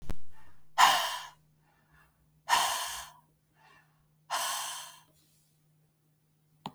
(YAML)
exhalation_length: 6.7 s
exhalation_amplitude: 13471
exhalation_signal_mean_std_ratio: 0.41
survey_phase: beta (2021-08-13 to 2022-03-07)
age: 45-64
gender: Female
wearing_mask: 'No'
symptom_cough_any: true
symptom_runny_or_blocked_nose: true
symptom_sore_throat: true
symptom_fatigue: true
symptom_headache: true
smoker_status: Never smoked
respiratory_condition_asthma: false
respiratory_condition_other: false
recruitment_source: Test and Trace
submission_delay: 2 days
covid_test_result: Positive
covid_test_method: RT-qPCR
covid_ct_value: 25.3
covid_ct_gene: ORF1ab gene
covid_ct_mean: 25.8
covid_viral_load: 3500 copies/ml
covid_viral_load_category: Minimal viral load (< 10K copies/ml)